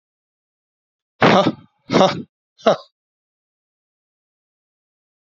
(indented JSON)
{
  "exhalation_length": "5.2 s",
  "exhalation_amplitude": 32768,
  "exhalation_signal_mean_std_ratio": 0.27,
  "survey_phase": "beta (2021-08-13 to 2022-03-07)",
  "age": "45-64",
  "gender": "Male",
  "wearing_mask": "No",
  "symptom_none": true,
  "smoker_status": "Never smoked",
  "respiratory_condition_asthma": false,
  "respiratory_condition_other": false,
  "recruitment_source": "REACT",
  "submission_delay": "2 days",
  "covid_test_result": "Negative",
  "covid_test_method": "RT-qPCR",
  "influenza_a_test_result": "Unknown/Void",
  "influenza_b_test_result": "Unknown/Void"
}